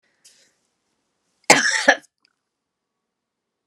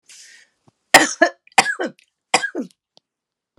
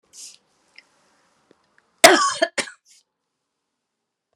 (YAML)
exhalation_length: 3.7 s
exhalation_amplitude: 32768
exhalation_signal_mean_std_ratio: 0.23
three_cough_length: 3.6 s
three_cough_amplitude: 32768
three_cough_signal_mean_std_ratio: 0.28
cough_length: 4.4 s
cough_amplitude: 32768
cough_signal_mean_std_ratio: 0.21
survey_phase: beta (2021-08-13 to 2022-03-07)
age: 65+
gender: Female
wearing_mask: 'No'
symptom_none: true
symptom_onset: 13 days
smoker_status: Ex-smoker
respiratory_condition_asthma: false
respiratory_condition_other: false
recruitment_source: REACT
submission_delay: 2 days
covid_test_result: Negative
covid_test_method: RT-qPCR